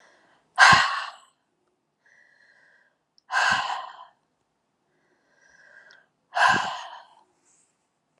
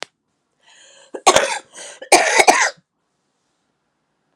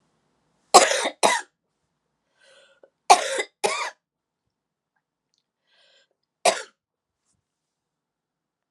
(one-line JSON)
{"exhalation_length": "8.2 s", "exhalation_amplitude": 29901, "exhalation_signal_mean_std_ratio": 0.29, "cough_length": "4.4 s", "cough_amplitude": 32768, "cough_signal_mean_std_ratio": 0.33, "three_cough_length": "8.7 s", "three_cough_amplitude": 32767, "three_cough_signal_mean_std_ratio": 0.23, "survey_phase": "beta (2021-08-13 to 2022-03-07)", "age": "45-64", "gender": "Female", "wearing_mask": "No", "symptom_runny_or_blocked_nose": true, "symptom_fever_high_temperature": true, "symptom_change_to_sense_of_smell_or_taste": true, "symptom_loss_of_taste": true, "symptom_onset": "3 days", "smoker_status": "Ex-smoker", "respiratory_condition_asthma": true, "respiratory_condition_other": false, "recruitment_source": "Test and Trace", "submission_delay": "2 days", "covid_test_result": "Positive", "covid_test_method": "RT-qPCR", "covid_ct_value": 16.8, "covid_ct_gene": "ORF1ab gene", "covid_ct_mean": 17.0, "covid_viral_load": "2700000 copies/ml", "covid_viral_load_category": "High viral load (>1M copies/ml)"}